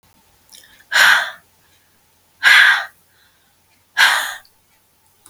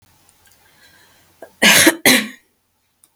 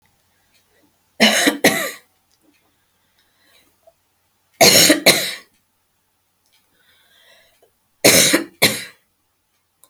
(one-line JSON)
{"exhalation_length": "5.3 s", "exhalation_amplitude": 32768, "exhalation_signal_mean_std_ratio": 0.36, "cough_length": "3.2 s", "cough_amplitude": 32768, "cough_signal_mean_std_ratio": 0.33, "three_cough_length": "9.9 s", "three_cough_amplitude": 32768, "three_cough_signal_mean_std_ratio": 0.32, "survey_phase": "beta (2021-08-13 to 2022-03-07)", "age": "65+", "gender": "Female", "wearing_mask": "No", "symptom_fatigue": true, "smoker_status": "Never smoked", "respiratory_condition_asthma": true, "respiratory_condition_other": false, "recruitment_source": "REACT", "submission_delay": "1 day", "covid_test_result": "Negative", "covid_test_method": "RT-qPCR", "influenza_a_test_result": "Negative", "influenza_b_test_result": "Negative"}